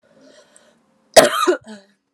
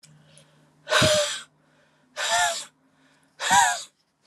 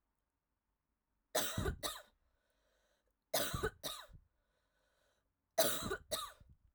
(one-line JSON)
{"cough_length": "2.1 s", "cough_amplitude": 32768, "cough_signal_mean_std_ratio": 0.3, "exhalation_length": "4.3 s", "exhalation_amplitude": 18652, "exhalation_signal_mean_std_ratio": 0.45, "three_cough_length": "6.7 s", "three_cough_amplitude": 4516, "three_cough_signal_mean_std_ratio": 0.37, "survey_phase": "alpha (2021-03-01 to 2021-08-12)", "age": "18-44", "gender": "Female", "wearing_mask": "No", "symptom_headache": true, "symptom_loss_of_taste": true, "smoker_status": "Never smoked", "respiratory_condition_asthma": false, "respiratory_condition_other": false, "recruitment_source": "Test and Trace", "submission_delay": "1 day", "covid_test_result": "Positive", "covid_test_method": "RT-qPCR", "covid_ct_value": 19.2, "covid_ct_gene": "ORF1ab gene"}